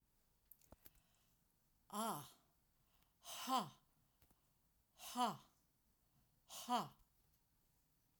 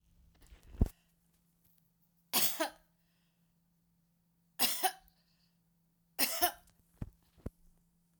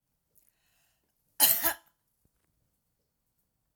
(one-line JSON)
{"exhalation_length": "8.2 s", "exhalation_amplitude": 1388, "exhalation_signal_mean_std_ratio": 0.31, "three_cough_length": "8.2 s", "three_cough_amplitude": 6181, "three_cough_signal_mean_std_ratio": 0.28, "cough_length": "3.8 s", "cough_amplitude": 16268, "cough_signal_mean_std_ratio": 0.21, "survey_phase": "alpha (2021-03-01 to 2021-08-12)", "age": "65+", "gender": "Female", "wearing_mask": "No", "symptom_none": true, "smoker_status": "Never smoked", "respiratory_condition_asthma": false, "respiratory_condition_other": false, "recruitment_source": "REACT", "submission_delay": "1 day", "covid_test_result": "Negative", "covid_test_method": "RT-qPCR"}